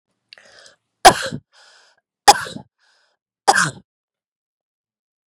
{"three_cough_length": "5.3 s", "three_cough_amplitude": 32768, "three_cough_signal_mean_std_ratio": 0.21, "survey_phase": "beta (2021-08-13 to 2022-03-07)", "age": "45-64", "gender": "Female", "wearing_mask": "No", "symptom_none": true, "symptom_onset": "4 days", "smoker_status": "Never smoked", "respiratory_condition_asthma": false, "respiratory_condition_other": false, "recruitment_source": "REACT", "submission_delay": "3 days", "covid_test_result": "Negative", "covid_test_method": "RT-qPCR", "influenza_a_test_result": "Negative", "influenza_b_test_result": "Negative"}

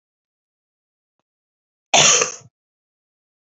{"cough_length": "3.4 s", "cough_amplitude": 32768, "cough_signal_mean_std_ratio": 0.25, "survey_phase": "beta (2021-08-13 to 2022-03-07)", "age": "18-44", "gender": "Female", "wearing_mask": "No", "symptom_new_continuous_cough": true, "symptom_runny_or_blocked_nose": true, "symptom_fatigue": true, "symptom_headache": true, "symptom_change_to_sense_of_smell_or_taste": true, "symptom_loss_of_taste": true, "symptom_other": true, "symptom_onset": "4 days", "smoker_status": "Ex-smoker", "respiratory_condition_asthma": false, "respiratory_condition_other": false, "recruitment_source": "Test and Trace", "submission_delay": "2 days", "covid_test_result": "Positive", "covid_test_method": "RT-qPCR", "covid_ct_value": 12.2, "covid_ct_gene": "ORF1ab gene", "covid_ct_mean": 12.6, "covid_viral_load": "71000000 copies/ml", "covid_viral_load_category": "High viral load (>1M copies/ml)"}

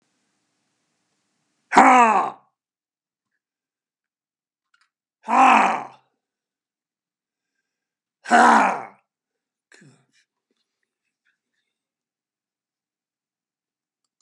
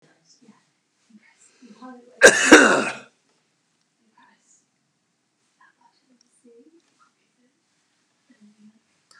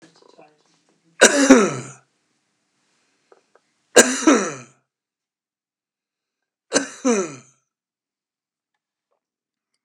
{"exhalation_length": "14.2 s", "exhalation_amplitude": 32768, "exhalation_signal_mean_std_ratio": 0.25, "cough_length": "9.2 s", "cough_amplitude": 32768, "cough_signal_mean_std_ratio": 0.19, "three_cough_length": "9.8 s", "three_cough_amplitude": 32768, "three_cough_signal_mean_std_ratio": 0.26, "survey_phase": "beta (2021-08-13 to 2022-03-07)", "age": "65+", "gender": "Male", "wearing_mask": "No", "symptom_none": true, "smoker_status": "Never smoked", "respiratory_condition_asthma": false, "respiratory_condition_other": false, "recruitment_source": "REACT", "submission_delay": "1 day", "covid_test_result": "Negative", "covid_test_method": "RT-qPCR", "influenza_a_test_result": "Negative", "influenza_b_test_result": "Negative"}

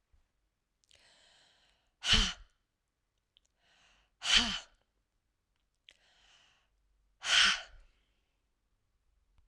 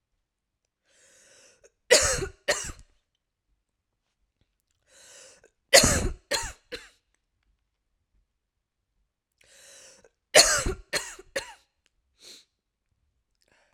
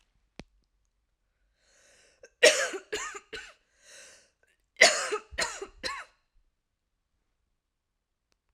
{"exhalation_length": "9.5 s", "exhalation_amplitude": 9349, "exhalation_signal_mean_std_ratio": 0.25, "three_cough_length": "13.7 s", "three_cough_amplitude": 32768, "three_cough_signal_mean_std_ratio": 0.24, "cough_length": "8.5 s", "cough_amplitude": 22976, "cough_signal_mean_std_ratio": 0.24, "survey_phase": "alpha (2021-03-01 to 2021-08-12)", "age": "45-64", "gender": "Female", "wearing_mask": "No", "symptom_shortness_of_breath": true, "symptom_fatigue": true, "symptom_headache": true, "symptom_onset": "2 days", "smoker_status": "Ex-smoker", "respiratory_condition_asthma": true, "respiratory_condition_other": false, "recruitment_source": "Test and Trace", "submission_delay": "1 day", "covid_test_result": "Positive", "covid_test_method": "RT-qPCR"}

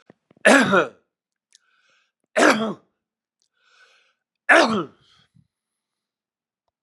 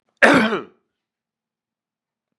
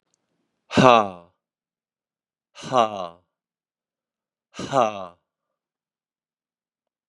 {"three_cough_length": "6.8 s", "three_cough_amplitude": 31779, "three_cough_signal_mean_std_ratio": 0.3, "cough_length": "2.4 s", "cough_amplitude": 32768, "cough_signal_mean_std_ratio": 0.29, "exhalation_length": "7.1 s", "exhalation_amplitude": 32767, "exhalation_signal_mean_std_ratio": 0.23, "survey_phase": "beta (2021-08-13 to 2022-03-07)", "age": "65+", "gender": "Male", "wearing_mask": "No", "symptom_cough_any": true, "symptom_onset": "3 days", "smoker_status": "Never smoked", "respiratory_condition_asthma": true, "respiratory_condition_other": true, "recruitment_source": "Test and Trace", "submission_delay": "3 days", "covid_test_result": "Positive", "covid_test_method": "ePCR"}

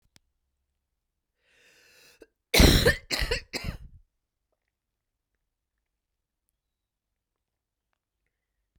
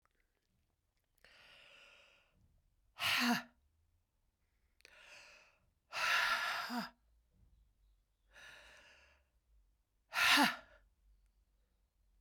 {"cough_length": "8.8 s", "cough_amplitude": 23033, "cough_signal_mean_std_ratio": 0.21, "exhalation_length": "12.2 s", "exhalation_amplitude": 4893, "exhalation_signal_mean_std_ratio": 0.31, "survey_phase": "beta (2021-08-13 to 2022-03-07)", "age": "45-64", "gender": "Female", "wearing_mask": "No", "symptom_cough_any": true, "symptom_runny_or_blocked_nose": true, "symptom_sore_throat": true, "symptom_fatigue": true, "symptom_fever_high_temperature": true, "symptom_headache": true, "symptom_change_to_sense_of_smell_or_taste": true, "symptom_loss_of_taste": true, "symptom_onset": "2 days", "smoker_status": "Never smoked", "respiratory_condition_asthma": false, "respiratory_condition_other": false, "recruitment_source": "Test and Trace", "submission_delay": "1 day", "covid_test_result": "Positive", "covid_test_method": "RT-qPCR"}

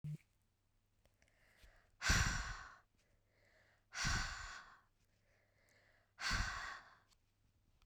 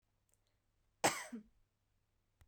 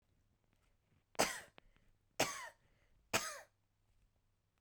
{"exhalation_length": "7.9 s", "exhalation_amplitude": 3308, "exhalation_signal_mean_std_ratio": 0.38, "cough_length": "2.5 s", "cough_amplitude": 4636, "cough_signal_mean_std_ratio": 0.22, "three_cough_length": "4.6 s", "three_cough_amplitude": 3949, "three_cough_signal_mean_std_ratio": 0.27, "survey_phase": "beta (2021-08-13 to 2022-03-07)", "age": "18-44", "gender": "Female", "wearing_mask": "No", "symptom_cough_any": true, "symptom_runny_or_blocked_nose": true, "symptom_sore_throat": true, "symptom_diarrhoea": true, "symptom_fever_high_temperature": true, "symptom_headache": true, "symptom_change_to_sense_of_smell_or_taste": true, "symptom_loss_of_taste": true, "symptom_onset": "6 days", "smoker_status": "Never smoked", "respiratory_condition_asthma": false, "respiratory_condition_other": false, "recruitment_source": "Test and Trace", "submission_delay": "2 days", "covid_test_result": "Positive", "covid_test_method": "RT-qPCR"}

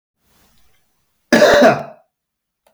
{"cough_length": "2.7 s", "cough_amplitude": 32768, "cough_signal_mean_std_ratio": 0.35, "survey_phase": "beta (2021-08-13 to 2022-03-07)", "age": "45-64", "gender": "Male", "wearing_mask": "No", "symptom_fatigue": true, "symptom_other": true, "symptom_onset": "4 days", "smoker_status": "Never smoked", "respiratory_condition_asthma": false, "respiratory_condition_other": false, "recruitment_source": "Test and Trace", "submission_delay": "1 day", "covid_test_result": "Positive", "covid_test_method": "RT-qPCR", "covid_ct_value": 15.7, "covid_ct_gene": "ORF1ab gene", "covid_ct_mean": 16.8, "covid_viral_load": "3200000 copies/ml", "covid_viral_load_category": "High viral load (>1M copies/ml)"}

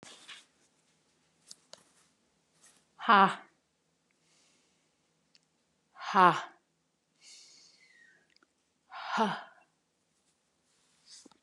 {"exhalation_length": "11.4 s", "exhalation_amplitude": 13975, "exhalation_signal_mean_std_ratio": 0.2, "survey_phase": "beta (2021-08-13 to 2022-03-07)", "age": "45-64", "gender": "Female", "wearing_mask": "No", "symptom_none": true, "smoker_status": "Never smoked", "respiratory_condition_asthma": false, "respiratory_condition_other": false, "recruitment_source": "REACT", "submission_delay": "1 day", "covid_test_result": "Negative", "covid_test_method": "RT-qPCR", "influenza_a_test_result": "Negative", "influenza_b_test_result": "Negative"}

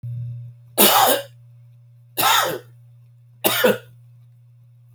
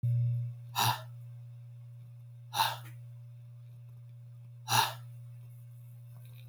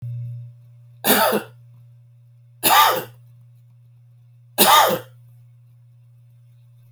{"cough_length": "4.9 s", "cough_amplitude": 32767, "cough_signal_mean_std_ratio": 0.45, "exhalation_length": "6.5 s", "exhalation_amplitude": 8613, "exhalation_signal_mean_std_ratio": 0.58, "three_cough_length": "6.9 s", "three_cough_amplitude": 32767, "three_cough_signal_mean_std_ratio": 0.38, "survey_phase": "alpha (2021-03-01 to 2021-08-12)", "age": "45-64", "gender": "Male", "wearing_mask": "No", "symptom_none": true, "smoker_status": "Never smoked", "respiratory_condition_asthma": false, "respiratory_condition_other": false, "recruitment_source": "REACT", "submission_delay": "1 day", "covid_test_result": "Negative", "covid_test_method": "RT-qPCR"}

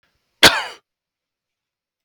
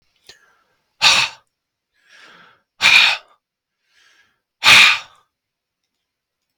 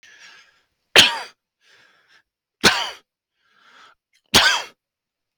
{"cough_length": "2.0 s", "cough_amplitude": 32768, "cough_signal_mean_std_ratio": 0.21, "exhalation_length": "6.6 s", "exhalation_amplitude": 32768, "exhalation_signal_mean_std_ratio": 0.3, "three_cough_length": "5.4 s", "three_cough_amplitude": 32768, "three_cough_signal_mean_std_ratio": 0.27, "survey_phase": "beta (2021-08-13 to 2022-03-07)", "age": "45-64", "gender": "Male", "wearing_mask": "No", "symptom_none": true, "smoker_status": "Ex-smoker", "respiratory_condition_asthma": false, "respiratory_condition_other": false, "recruitment_source": "REACT", "submission_delay": "3 days", "covid_test_result": "Negative", "covid_test_method": "RT-qPCR"}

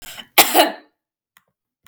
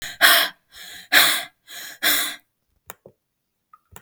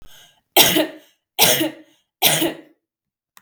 {"cough_length": "1.9 s", "cough_amplitude": 32768, "cough_signal_mean_std_ratio": 0.31, "exhalation_length": "4.0 s", "exhalation_amplitude": 32766, "exhalation_signal_mean_std_ratio": 0.39, "three_cough_length": "3.4 s", "three_cough_amplitude": 32768, "three_cough_signal_mean_std_ratio": 0.42, "survey_phase": "beta (2021-08-13 to 2022-03-07)", "age": "18-44", "gender": "Female", "wearing_mask": "No", "symptom_none": true, "smoker_status": "Never smoked", "respiratory_condition_asthma": false, "respiratory_condition_other": false, "recruitment_source": "REACT", "submission_delay": "2 days", "covid_test_result": "Negative", "covid_test_method": "RT-qPCR"}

